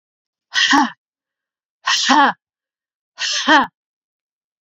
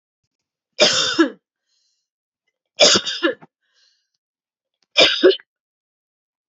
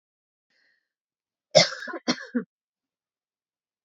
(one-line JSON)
{"exhalation_length": "4.6 s", "exhalation_amplitude": 29650, "exhalation_signal_mean_std_ratio": 0.4, "three_cough_length": "6.5 s", "three_cough_amplitude": 32768, "three_cough_signal_mean_std_ratio": 0.33, "cough_length": "3.8 s", "cough_amplitude": 26854, "cough_signal_mean_std_ratio": 0.21, "survey_phase": "beta (2021-08-13 to 2022-03-07)", "age": "45-64", "gender": "Female", "wearing_mask": "No", "symptom_none": true, "smoker_status": "Never smoked", "respiratory_condition_asthma": false, "respiratory_condition_other": false, "recruitment_source": "REACT", "submission_delay": "4 days", "covid_test_result": "Negative", "covid_test_method": "RT-qPCR", "influenza_a_test_result": "Negative", "influenza_b_test_result": "Negative"}